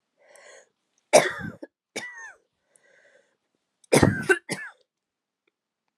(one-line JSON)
{"cough_length": "6.0 s", "cough_amplitude": 26081, "cough_signal_mean_std_ratio": 0.25, "survey_phase": "alpha (2021-03-01 to 2021-08-12)", "age": "18-44", "gender": "Female", "wearing_mask": "No", "symptom_cough_any": true, "symptom_shortness_of_breath": true, "symptom_fatigue": true, "symptom_headache": true, "symptom_change_to_sense_of_smell_or_taste": true, "symptom_loss_of_taste": true, "symptom_onset": "6 days", "smoker_status": "Never smoked", "respiratory_condition_asthma": false, "respiratory_condition_other": false, "recruitment_source": "Test and Trace", "submission_delay": "3 days", "covid_test_result": "Positive", "covid_test_method": "RT-qPCR", "covid_ct_value": 16.6, "covid_ct_gene": "N gene", "covid_ct_mean": 17.0, "covid_viral_load": "2700000 copies/ml", "covid_viral_load_category": "High viral load (>1M copies/ml)"}